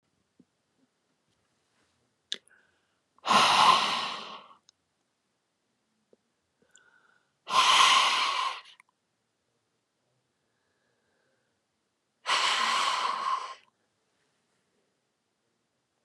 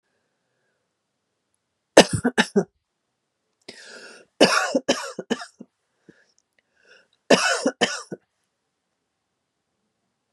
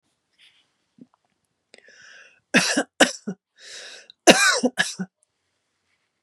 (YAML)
exhalation_length: 16.0 s
exhalation_amplitude: 13963
exhalation_signal_mean_std_ratio: 0.34
three_cough_length: 10.3 s
three_cough_amplitude: 32768
three_cough_signal_mean_std_ratio: 0.25
cough_length: 6.2 s
cough_amplitude: 32768
cough_signal_mean_std_ratio: 0.28
survey_phase: beta (2021-08-13 to 2022-03-07)
age: 45-64
gender: Female
wearing_mask: 'No'
symptom_runny_or_blocked_nose: true
symptom_diarrhoea: true
symptom_headache: true
symptom_onset: 12 days
smoker_status: Ex-smoker
respiratory_condition_asthma: false
respiratory_condition_other: false
recruitment_source: REACT
submission_delay: 1 day
covid_test_result: Negative
covid_test_method: RT-qPCR
influenza_a_test_result: Negative
influenza_b_test_result: Negative